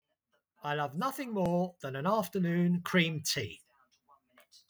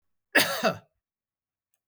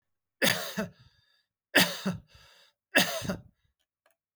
{"exhalation_length": "4.7 s", "exhalation_amplitude": 6062, "exhalation_signal_mean_std_ratio": 0.66, "cough_length": "1.9 s", "cough_amplitude": 13339, "cough_signal_mean_std_ratio": 0.32, "three_cough_length": "4.4 s", "three_cough_amplitude": 17954, "three_cough_signal_mean_std_ratio": 0.35, "survey_phase": "beta (2021-08-13 to 2022-03-07)", "age": "45-64", "gender": "Male", "wearing_mask": "No", "symptom_fatigue": true, "smoker_status": "Never smoked", "respiratory_condition_asthma": false, "respiratory_condition_other": false, "recruitment_source": "REACT", "submission_delay": "9 days", "covid_test_result": "Negative", "covid_test_method": "RT-qPCR"}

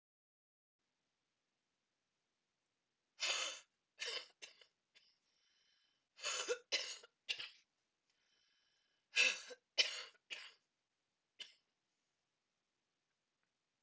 {"exhalation_length": "13.8 s", "exhalation_amplitude": 4025, "exhalation_signal_mean_std_ratio": 0.26, "survey_phase": "beta (2021-08-13 to 2022-03-07)", "age": "45-64", "gender": "Female", "wearing_mask": "No", "symptom_cough_any": true, "symptom_fatigue": true, "symptom_fever_high_temperature": true, "symptom_headache": true, "symptom_other": true, "smoker_status": "Never smoked", "respiratory_condition_asthma": false, "respiratory_condition_other": false, "recruitment_source": "Test and Trace", "submission_delay": "1 day", "covid_test_result": "Positive", "covid_test_method": "RT-qPCR", "covid_ct_value": 24.3, "covid_ct_gene": "ORF1ab gene", "covid_ct_mean": 24.6, "covid_viral_load": "8500 copies/ml", "covid_viral_load_category": "Minimal viral load (< 10K copies/ml)"}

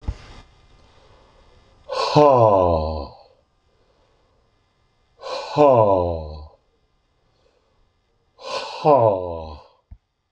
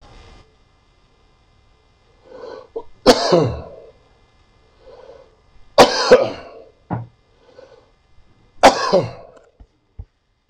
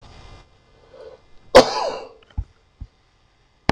{"exhalation_length": "10.3 s", "exhalation_amplitude": 26022, "exhalation_signal_mean_std_ratio": 0.4, "three_cough_length": "10.5 s", "three_cough_amplitude": 26028, "three_cough_signal_mean_std_ratio": 0.29, "cough_length": "3.7 s", "cough_amplitude": 26028, "cough_signal_mean_std_ratio": 0.23, "survey_phase": "beta (2021-08-13 to 2022-03-07)", "age": "65+", "gender": "Male", "wearing_mask": "No", "symptom_cough_any": true, "symptom_shortness_of_breath": true, "symptom_fatigue": true, "smoker_status": "Ex-smoker", "respiratory_condition_asthma": false, "respiratory_condition_other": false, "recruitment_source": "Test and Trace", "submission_delay": "3 days", "covid_test_result": "Positive", "covid_test_method": "LFT"}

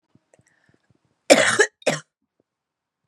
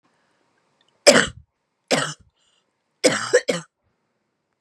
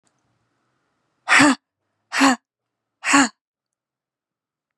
{"cough_length": "3.1 s", "cough_amplitude": 32768, "cough_signal_mean_std_ratio": 0.27, "three_cough_length": "4.6 s", "three_cough_amplitude": 32768, "three_cough_signal_mean_std_ratio": 0.28, "exhalation_length": "4.8 s", "exhalation_amplitude": 31064, "exhalation_signal_mean_std_ratio": 0.3, "survey_phase": "beta (2021-08-13 to 2022-03-07)", "age": "18-44", "gender": "Female", "wearing_mask": "No", "symptom_cough_any": true, "symptom_new_continuous_cough": true, "symptom_runny_or_blocked_nose": true, "symptom_shortness_of_breath": true, "symptom_fatigue": true, "smoker_status": "Never smoked", "respiratory_condition_asthma": false, "respiratory_condition_other": false, "recruitment_source": "Test and Trace", "submission_delay": "1 day", "covid_test_result": "Positive", "covid_test_method": "ePCR"}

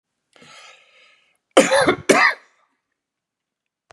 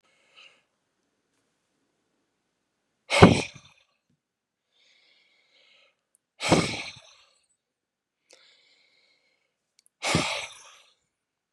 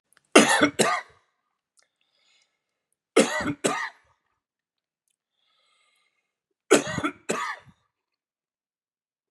{"cough_length": "3.9 s", "cough_amplitude": 32766, "cough_signal_mean_std_ratio": 0.31, "exhalation_length": "11.5 s", "exhalation_amplitude": 32767, "exhalation_signal_mean_std_ratio": 0.19, "three_cough_length": "9.3 s", "three_cough_amplitude": 32481, "three_cough_signal_mean_std_ratio": 0.28, "survey_phase": "beta (2021-08-13 to 2022-03-07)", "age": "65+", "gender": "Male", "wearing_mask": "No", "symptom_none": true, "smoker_status": "Ex-smoker", "respiratory_condition_asthma": false, "respiratory_condition_other": false, "recruitment_source": "REACT", "submission_delay": "1 day", "covid_test_result": "Negative", "covid_test_method": "RT-qPCR", "influenza_a_test_result": "Negative", "influenza_b_test_result": "Negative"}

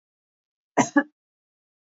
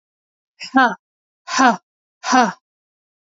{"cough_length": "1.9 s", "cough_amplitude": 19750, "cough_signal_mean_std_ratio": 0.21, "exhalation_length": "3.2 s", "exhalation_amplitude": 27652, "exhalation_signal_mean_std_ratio": 0.34, "survey_phase": "beta (2021-08-13 to 2022-03-07)", "age": "18-44", "gender": "Female", "wearing_mask": "No", "symptom_none": true, "smoker_status": "Ex-smoker", "respiratory_condition_asthma": false, "respiratory_condition_other": false, "recruitment_source": "REACT", "submission_delay": "0 days", "covid_test_result": "Negative", "covid_test_method": "RT-qPCR", "influenza_a_test_result": "Negative", "influenza_b_test_result": "Negative"}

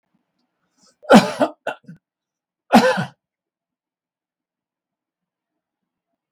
{"cough_length": "6.3 s", "cough_amplitude": 32768, "cough_signal_mean_std_ratio": 0.23, "survey_phase": "beta (2021-08-13 to 2022-03-07)", "age": "65+", "gender": "Male", "wearing_mask": "No", "symptom_none": true, "smoker_status": "Ex-smoker", "respiratory_condition_asthma": false, "respiratory_condition_other": false, "recruitment_source": "REACT", "submission_delay": "3 days", "covid_test_result": "Negative", "covid_test_method": "RT-qPCR", "influenza_a_test_result": "Unknown/Void", "influenza_b_test_result": "Unknown/Void"}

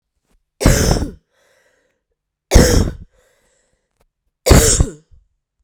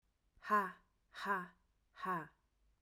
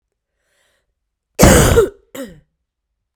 {"three_cough_length": "5.6 s", "three_cough_amplitude": 32768, "three_cough_signal_mean_std_ratio": 0.36, "exhalation_length": "2.8 s", "exhalation_amplitude": 2584, "exhalation_signal_mean_std_ratio": 0.41, "cough_length": "3.2 s", "cough_amplitude": 32768, "cough_signal_mean_std_ratio": 0.33, "survey_phase": "beta (2021-08-13 to 2022-03-07)", "age": "18-44", "gender": "Female", "wearing_mask": "No", "symptom_cough_any": true, "symptom_new_continuous_cough": true, "symptom_runny_or_blocked_nose": true, "symptom_shortness_of_breath": true, "symptom_sore_throat": true, "symptom_fatigue": true, "symptom_fever_high_temperature": true, "symptom_headache": true, "symptom_change_to_sense_of_smell_or_taste": true, "symptom_loss_of_taste": true, "symptom_other": true, "smoker_status": "Never smoked", "respiratory_condition_asthma": false, "respiratory_condition_other": false, "recruitment_source": "Test and Trace", "submission_delay": "1 day", "covid_test_result": "Positive", "covid_test_method": "RT-qPCR", "covid_ct_value": 24.0, "covid_ct_gene": "N gene"}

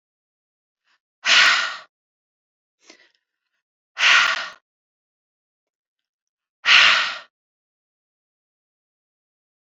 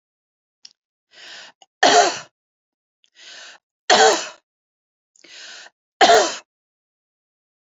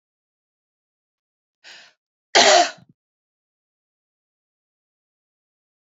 {"exhalation_length": "9.6 s", "exhalation_amplitude": 28053, "exhalation_signal_mean_std_ratio": 0.29, "three_cough_length": "7.8 s", "three_cough_amplitude": 29617, "three_cough_signal_mean_std_ratio": 0.29, "cough_length": "5.8 s", "cough_amplitude": 29862, "cough_signal_mean_std_ratio": 0.19, "survey_phase": "beta (2021-08-13 to 2022-03-07)", "age": "65+", "gender": "Female", "wearing_mask": "No", "symptom_none": true, "smoker_status": "Never smoked", "respiratory_condition_asthma": true, "respiratory_condition_other": false, "recruitment_source": "REACT", "submission_delay": "2 days", "covid_test_result": "Negative", "covid_test_method": "RT-qPCR", "influenza_a_test_result": "Negative", "influenza_b_test_result": "Negative"}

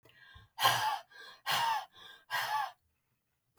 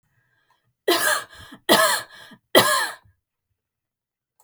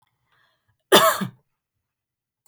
{"exhalation_length": "3.6 s", "exhalation_amplitude": 8498, "exhalation_signal_mean_std_ratio": 0.5, "three_cough_length": "4.4 s", "three_cough_amplitude": 32766, "three_cough_signal_mean_std_ratio": 0.38, "cough_length": "2.5 s", "cough_amplitude": 32768, "cough_signal_mean_std_ratio": 0.26, "survey_phase": "beta (2021-08-13 to 2022-03-07)", "age": "18-44", "gender": "Female", "wearing_mask": "No", "symptom_none": true, "smoker_status": "Never smoked", "respiratory_condition_asthma": false, "respiratory_condition_other": false, "recruitment_source": "REACT", "submission_delay": "2 days", "covid_test_result": "Negative", "covid_test_method": "RT-qPCR", "influenza_a_test_result": "Negative", "influenza_b_test_result": "Negative"}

